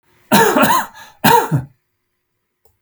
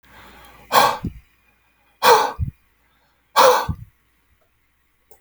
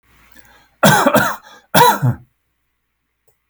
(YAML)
three_cough_length: 2.8 s
three_cough_amplitude: 32768
three_cough_signal_mean_std_ratio: 0.47
exhalation_length: 5.2 s
exhalation_amplitude: 32767
exhalation_signal_mean_std_ratio: 0.34
cough_length: 3.5 s
cough_amplitude: 32768
cough_signal_mean_std_ratio: 0.41
survey_phase: alpha (2021-03-01 to 2021-08-12)
age: 45-64
gender: Male
wearing_mask: 'No'
symptom_none: true
smoker_status: Never smoked
respiratory_condition_asthma: false
respiratory_condition_other: false
recruitment_source: REACT
submission_delay: 2 days
covid_test_result: Negative
covid_test_method: RT-qPCR